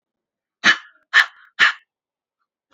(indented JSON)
{
  "exhalation_length": "2.7 s",
  "exhalation_amplitude": 29610,
  "exhalation_signal_mean_std_ratio": 0.28,
  "survey_phase": "beta (2021-08-13 to 2022-03-07)",
  "age": "18-44",
  "gender": "Female",
  "wearing_mask": "No",
  "symptom_none": true,
  "smoker_status": "Never smoked",
  "respiratory_condition_asthma": true,
  "respiratory_condition_other": false,
  "recruitment_source": "REACT",
  "submission_delay": "1 day",
  "covid_test_result": "Negative",
  "covid_test_method": "RT-qPCR",
  "influenza_a_test_result": "Unknown/Void",
  "influenza_b_test_result": "Unknown/Void"
}